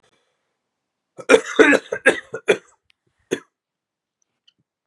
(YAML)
cough_length: 4.9 s
cough_amplitude: 32767
cough_signal_mean_std_ratio: 0.26
survey_phase: beta (2021-08-13 to 2022-03-07)
age: 18-44
gender: Male
wearing_mask: 'No'
symptom_cough_any: true
symptom_new_continuous_cough: true
symptom_runny_or_blocked_nose: true
symptom_sore_throat: true
symptom_fatigue: true
symptom_fever_high_temperature: true
symptom_headache: true
symptom_change_to_sense_of_smell_or_taste: true
symptom_onset: 3 days
smoker_status: Never smoked
respiratory_condition_asthma: false
respiratory_condition_other: false
recruitment_source: Test and Trace
submission_delay: 2 days
covid_test_result: Positive
covid_test_method: RT-qPCR
covid_ct_value: 20.6
covid_ct_gene: ORF1ab gene